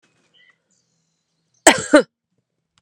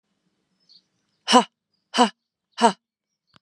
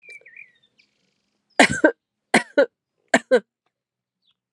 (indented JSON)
{
  "cough_length": "2.8 s",
  "cough_amplitude": 32768,
  "cough_signal_mean_std_ratio": 0.21,
  "exhalation_length": "3.4 s",
  "exhalation_amplitude": 31290,
  "exhalation_signal_mean_std_ratio": 0.24,
  "three_cough_length": "4.5 s",
  "three_cough_amplitude": 32316,
  "three_cough_signal_mean_std_ratio": 0.26,
  "survey_phase": "alpha (2021-03-01 to 2021-08-12)",
  "age": "45-64",
  "gender": "Female",
  "wearing_mask": "No",
  "symptom_none": true,
  "smoker_status": "Ex-smoker",
  "respiratory_condition_asthma": false,
  "respiratory_condition_other": false,
  "recruitment_source": "REACT",
  "submission_delay": "1 day",
  "covid_test_result": "Negative",
  "covid_test_method": "RT-qPCR"
}